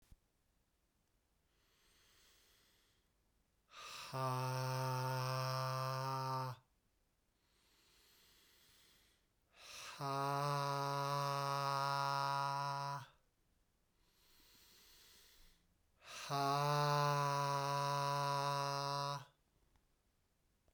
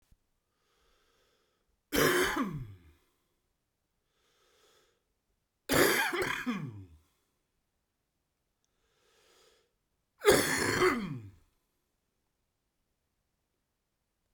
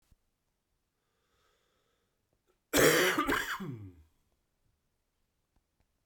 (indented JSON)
{
  "exhalation_length": "20.7 s",
  "exhalation_amplitude": 2262,
  "exhalation_signal_mean_std_ratio": 0.59,
  "three_cough_length": "14.3 s",
  "three_cough_amplitude": 10695,
  "three_cough_signal_mean_std_ratio": 0.32,
  "cough_length": "6.1 s",
  "cough_amplitude": 9777,
  "cough_signal_mean_std_ratio": 0.3,
  "survey_phase": "beta (2021-08-13 to 2022-03-07)",
  "age": "45-64",
  "gender": "Male",
  "wearing_mask": "No",
  "symptom_cough_any": true,
  "symptom_fatigue": true,
  "symptom_headache": true,
  "symptom_other": true,
  "smoker_status": "Ex-smoker",
  "respiratory_condition_asthma": true,
  "respiratory_condition_other": false,
  "recruitment_source": "Test and Trace",
  "submission_delay": "2 days",
  "covid_test_result": "Positive",
  "covid_test_method": "RT-qPCR"
}